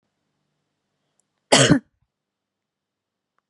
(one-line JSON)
{"cough_length": "3.5 s", "cough_amplitude": 30567, "cough_signal_mean_std_ratio": 0.21, "survey_phase": "beta (2021-08-13 to 2022-03-07)", "age": "18-44", "gender": "Female", "wearing_mask": "No", "symptom_none": true, "smoker_status": "Never smoked", "respiratory_condition_asthma": false, "respiratory_condition_other": false, "recruitment_source": "REACT", "submission_delay": "1 day", "covid_test_result": "Negative", "covid_test_method": "RT-qPCR"}